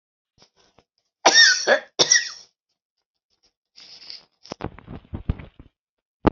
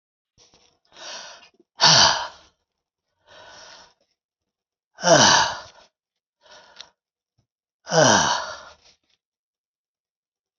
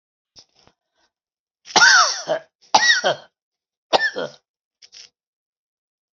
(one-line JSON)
{"cough_length": "6.3 s", "cough_amplitude": 27029, "cough_signal_mean_std_ratio": 0.28, "exhalation_length": "10.6 s", "exhalation_amplitude": 29394, "exhalation_signal_mean_std_ratio": 0.3, "three_cough_length": "6.1 s", "three_cough_amplitude": 32767, "three_cough_signal_mean_std_ratio": 0.33, "survey_phase": "beta (2021-08-13 to 2022-03-07)", "age": "65+", "gender": "Male", "wearing_mask": "No", "symptom_none": true, "smoker_status": "Never smoked", "respiratory_condition_asthma": false, "respiratory_condition_other": false, "recruitment_source": "REACT", "submission_delay": "2 days", "covid_test_result": "Negative", "covid_test_method": "RT-qPCR", "influenza_a_test_result": "Negative", "influenza_b_test_result": "Negative"}